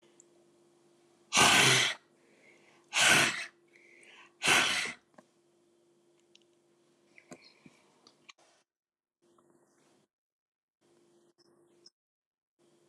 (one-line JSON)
{"exhalation_length": "12.9 s", "exhalation_amplitude": 11774, "exhalation_signal_mean_std_ratio": 0.28, "survey_phase": "alpha (2021-03-01 to 2021-08-12)", "age": "45-64", "gender": "Female", "wearing_mask": "No", "symptom_none": true, "smoker_status": "Never smoked", "respiratory_condition_asthma": false, "respiratory_condition_other": false, "recruitment_source": "REACT", "submission_delay": "3 days", "covid_test_result": "Negative", "covid_test_method": "RT-qPCR"}